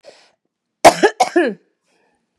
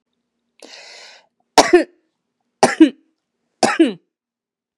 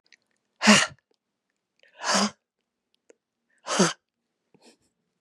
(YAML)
cough_length: 2.4 s
cough_amplitude: 32768
cough_signal_mean_std_ratio: 0.3
three_cough_length: 4.8 s
three_cough_amplitude: 32768
three_cough_signal_mean_std_ratio: 0.28
exhalation_length: 5.2 s
exhalation_amplitude: 29733
exhalation_signal_mean_std_ratio: 0.27
survey_phase: beta (2021-08-13 to 2022-03-07)
age: 45-64
gender: Female
wearing_mask: 'No'
symptom_none: true
smoker_status: Current smoker (1 to 10 cigarettes per day)
respiratory_condition_asthma: false
respiratory_condition_other: false
recruitment_source: REACT
submission_delay: 0 days
covid_test_result: Negative
covid_test_method: RT-qPCR
influenza_a_test_result: Negative
influenza_b_test_result: Negative